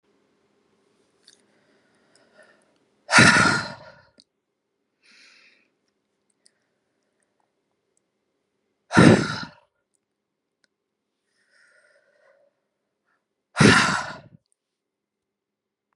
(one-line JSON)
{"exhalation_length": "16.0 s", "exhalation_amplitude": 31883, "exhalation_signal_mean_std_ratio": 0.22, "survey_phase": "beta (2021-08-13 to 2022-03-07)", "age": "18-44", "gender": "Female", "wearing_mask": "No", "symptom_none": true, "smoker_status": "Ex-smoker", "respiratory_condition_asthma": false, "respiratory_condition_other": false, "recruitment_source": "REACT", "submission_delay": "14 days", "covid_test_result": "Negative", "covid_test_method": "RT-qPCR"}